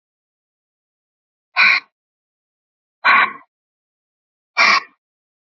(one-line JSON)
{"exhalation_length": "5.5 s", "exhalation_amplitude": 29081, "exhalation_signal_mean_std_ratio": 0.29, "survey_phase": "beta (2021-08-13 to 2022-03-07)", "age": "18-44", "gender": "Female", "wearing_mask": "No", "symptom_cough_any": true, "symptom_sore_throat": true, "symptom_fatigue": true, "symptom_headache": true, "symptom_onset": "3 days", "smoker_status": "Never smoked", "respiratory_condition_asthma": false, "respiratory_condition_other": false, "recruitment_source": "Test and Trace", "submission_delay": "2 days", "covid_test_result": "Positive", "covid_test_method": "RT-qPCR", "covid_ct_value": 30.2, "covid_ct_gene": "ORF1ab gene", "covid_ct_mean": 30.2, "covid_viral_load": "120 copies/ml", "covid_viral_load_category": "Minimal viral load (< 10K copies/ml)"}